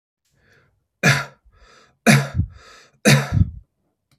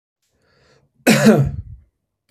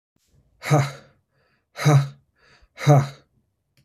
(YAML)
three_cough_length: 4.2 s
three_cough_amplitude: 31289
three_cough_signal_mean_std_ratio: 0.36
cough_length: 2.3 s
cough_amplitude: 32767
cough_signal_mean_std_ratio: 0.37
exhalation_length: 3.8 s
exhalation_amplitude: 22353
exhalation_signal_mean_std_ratio: 0.36
survey_phase: beta (2021-08-13 to 2022-03-07)
age: 45-64
gender: Male
wearing_mask: 'No'
symptom_none: true
smoker_status: Ex-smoker
respiratory_condition_asthma: false
respiratory_condition_other: false
recruitment_source: REACT
submission_delay: 3 days
covid_test_result: Negative
covid_test_method: RT-qPCR
influenza_a_test_result: Negative
influenza_b_test_result: Negative